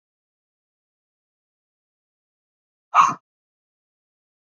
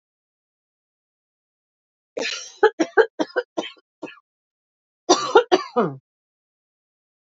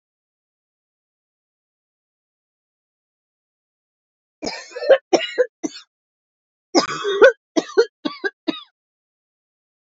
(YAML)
exhalation_length: 4.5 s
exhalation_amplitude: 26182
exhalation_signal_mean_std_ratio: 0.15
three_cough_length: 7.3 s
three_cough_amplitude: 28002
three_cough_signal_mean_std_ratio: 0.27
cough_length: 9.8 s
cough_amplitude: 29002
cough_signal_mean_std_ratio: 0.25
survey_phase: beta (2021-08-13 to 2022-03-07)
age: 45-64
gender: Female
wearing_mask: 'No'
symptom_runny_or_blocked_nose: true
symptom_change_to_sense_of_smell_or_taste: true
smoker_status: Ex-smoker
respiratory_condition_asthma: true
respiratory_condition_other: false
recruitment_source: REACT
submission_delay: 5 days
covid_test_result: Negative
covid_test_method: RT-qPCR
influenza_a_test_result: Negative
influenza_b_test_result: Negative